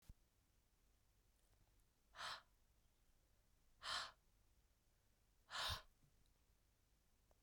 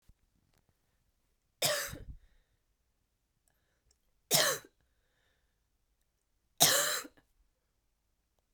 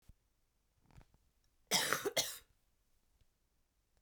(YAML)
exhalation_length: 7.4 s
exhalation_amplitude: 642
exhalation_signal_mean_std_ratio: 0.33
three_cough_length: 8.5 s
three_cough_amplitude: 19170
three_cough_signal_mean_std_ratio: 0.26
cough_length: 4.0 s
cough_amplitude: 5938
cough_signal_mean_std_ratio: 0.29
survey_phase: beta (2021-08-13 to 2022-03-07)
age: 18-44
gender: Female
wearing_mask: 'No'
symptom_cough_any: true
symptom_new_continuous_cough: true
symptom_runny_or_blocked_nose: true
symptom_headache: true
symptom_onset: 3 days
smoker_status: Never smoked
respiratory_condition_asthma: false
respiratory_condition_other: false
recruitment_source: Test and Trace
submission_delay: 2 days
covid_test_result: Positive
covid_test_method: RT-qPCR
covid_ct_value: 22.8
covid_ct_gene: N gene